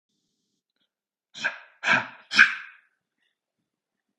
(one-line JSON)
{"exhalation_length": "4.2 s", "exhalation_amplitude": 29053, "exhalation_signal_mean_std_ratio": 0.24, "survey_phase": "beta (2021-08-13 to 2022-03-07)", "age": "18-44", "gender": "Male", "wearing_mask": "No", "symptom_cough_any": true, "symptom_sore_throat": true, "symptom_diarrhoea": true, "symptom_onset": "8 days", "smoker_status": "Ex-smoker", "respiratory_condition_asthma": false, "respiratory_condition_other": false, "recruitment_source": "REACT", "submission_delay": "0 days", "covid_test_result": "Negative", "covid_test_method": "RT-qPCR", "influenza_a_test_result": "Negative", "influenza_b_test_result": "Negative"}